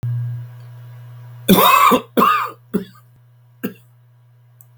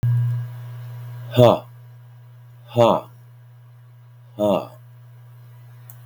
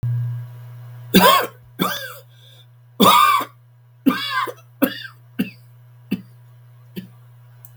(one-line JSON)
{"cough_length": "4.8 s", "cough_amplitude": 32768, "cough_signal_mean_std_ratio": 0.46, "exhalation_length": "6.1 s", "exhalation_amplitude": 32768, "exhalation_signal_mean_std_ratio": 0.43, "three_cough_length": "7.8 s", "three_cough_amplitude": 32768, "three_cough_signal_mean_std_ratio": 0.43, "survey_phase": "beta (2021-08-13 to 2022-03-07)", "age": "65+", "gender": "Male", "wearing_mask": "No", "symptom_cough_any": true, "symptom_sore_throat": true, "symptom_onset": "4 days", "smoker_status": "Ex-smoker", "respiratory_condition_asthma": false, "respiratory_condition_other": false, "recruitment_source": "Test and Trace", "submission_delay": "2 days", "covid_test_result": "Positive", "covid_test_method": "RT-qPCR", "covid_ct_value": 16.1, "covid_ct_gene": "ORF1ab gene", "covid_ct_mean": 16.4, "covid_viral_load": "4200000 copies/ml", "covid_viral_load_category": "High viral load (>1M copies/ml)"}